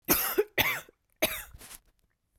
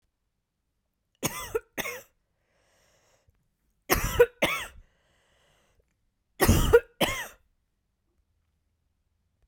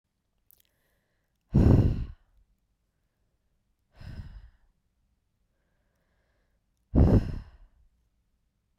{"cough_length": "2.4 s", "cough_amplitude": 11064, "cough_signal_mean_std_ratio": 0.43, "three_cough_length": "9.5 s", "three_cough_amplitude": 18531, "three_cough_signal_mean_std_ratio": 0.27, "exhalation_length": "8.8 s", "exhalation_amplitude": 12671, "exhalation_signal_mean_std_ratio": 0.26, "survey_phase": "beta (2021-08-13 to 2022-03-07)", "age": "18-44", "gender": "Female", "wearing_mask": "No", "symptom_new_continuous_cough": true, "symptom_runny_or_blocked_nose": true, "symptom_other": true, "symptom_onset": "4 days", "smoker_status": "Never smoked", "respiratory_condition_asthma": false, "respiratory_condition_other": false, "recruitment_source": "REACT", "submission_delay": "6 days", "covid_test_result": "Negative", "covid_test_method": "RT-qPCR", "influenza_a_test_result": "Unknown/Void", "influenza_b_test_result": "Unknown/Void"}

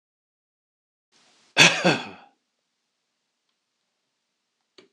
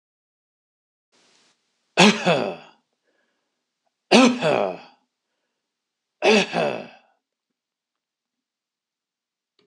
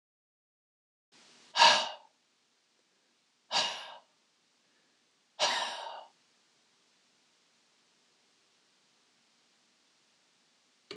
{"cough_length": "4.9 s", "cough_amplitude": 26028, "cough_signal_mean_std_ratio": 0.2, "three_cough_length": "9.7 s", "three_cough_amplitude": 26027, "three_cough_signal_mean_std_ratio": 0.29, "exhalation_length": "11.0 s", "exhalation_amplitude": 12917, "exhalation_signal_mean_std_ratio": 0.22, "survey_phase": "beta (2021-08-13 to 2022-03-07)", "age": "65+", "gender": "Male", "wearing_mask": "No", "symptom_none": true, "smoker_status": "Never smoked", "respiratory_condition_asthma": false, "respiratory_condition_other": false, "recruitment_source": "REACT", "submission_delay": "1 day", "covid_test_result": "Negative", "covid_test_method": "RT-qPCR"}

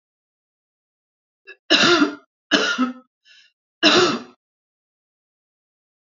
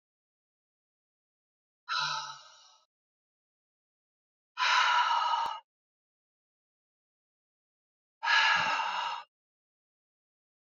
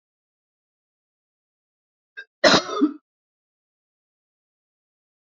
{"three_cough_length": "6.1 s", "three_cough_amplitude": 30010, "three_cough_signal_mean_std_ratio": 0.35, "exhalation_length": "10.7 s", "exhalation_amplitude": 6932, "exhalation_signal_mean_std_ratio": 0.37, "cough_length": "5.3 s", "cough_amplitude": 32767, "cough_signal_mean_std_ratio": 0.2, "survey_phase": "beta (2021-08-13 to 2022-03-07)", "age": "45-64", "gender": "Female", "wearing_mask": "No", "symptom_none": true, "smoker_status": "Current smoker (11 or more cigarettes per day)", "respiratory_condition_asthma": false, "respiratory_condition_other": false, "recruitment_source": "REACT", "submission_delay": "1 day", "covid_test_result": "Negative", "covid_test_method": "RT-qPCR", "influenza_a_test_result": "Negative", "influenza_b_test_result": "Negative"}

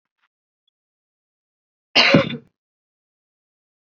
{"cough_length": "3.9 s", "cough_amplitude": 32201, "cough_signal_mean_std_ratio": 0.22, "survey_phase": "beta (2021-08-13 to 2022-03-07)", "age": "18-44", "gender": "Female", "wearing_mask": "No", "symptom_runny_or_blocked_nose": true, "symptom_fatigue": true, "symptom_onset": "6 days", "smoker_status": "Never smoked", "respiratory_condition_asthma": false, "respiratory_condition_other": false, "recruitment_source": "REACT", "submission_delay": "0 days", "covid_test_result": "Negative", "covid_test_method": "RT-qPCR", "influenza_a_test_result": "Negative", "influenza_b_test_result": "Negative"}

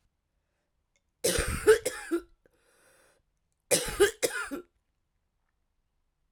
{"cough_length": "6.3 s", "cough_amplitude": 11232, "cough_signal_mean_std_ratio": 0.32, "survey_phase": "alpha (2021-03-01 to 2021-08-12)", "age": "45-64", "gender": "Female", "wearing_mask": "No", "symptom_cough_any": true, "symptom_new_continuous_cough": true, "symptom_fatigue": true, "symptom_headache": true, "symptom_onset": "2 days", "smoker_status": "Ex-smoker", "respiratory_condition_asthma": false, "respiratory_condition_other": false, "recruitment_source": "Test and Trace", "submission_delay": "1 day", "covid_test_result": "Positive", "covid_test_method": "RT-qPCR", "covid_ct_value": 18.2, "covid_ct_gene": "ORF1ab gene", "covid_ct_mean": 18.7, "covid_viral_load": "730000 copies/ml", "covid_viral_load_category": "Low viral load (10K-1M copies/ml)"}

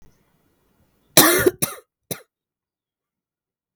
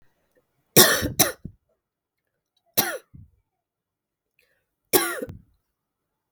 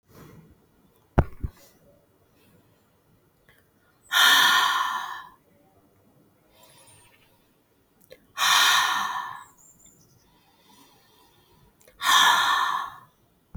{"cough_length": "3.8 s", "cough_amplitude": 32768, "cough_signal_mean_std_ratio": 0.25, "three_cough_length": "6.3 s", "three_cough_amplitude": 32766, "three_cough_signal_mean_std_ratio": 0.25, "exhalation_length": "13.6 s", "exhalation_amplitude": 17974, "exhalation_signal_mean_std_ratio": 0.38, "survey_phase": "beta (2021-08-13 to 2022-03-07)", "age": "18-44", "gender": "Female", "wearing_mask": "No", "symptom_cough_any": true, "symptom_runny_or_blocked_nose": true, "symptom_sore_throat": true, "symptom_diarrhoea": true, "symptom_fatigue": true, "symptom_onset": "3 days", "smoker_status": "Never smoked", "respiratory_condition_asthma": false, "respiratory_condition_other": false, "recruitment_source": "Test and Trace", "submission_delay": "1 day", "covid_test_result": "Positive", "covid_test_method": "RT-qPCR", "covid_ct_value": 17.6, "covid_ct_gene": "N gene"}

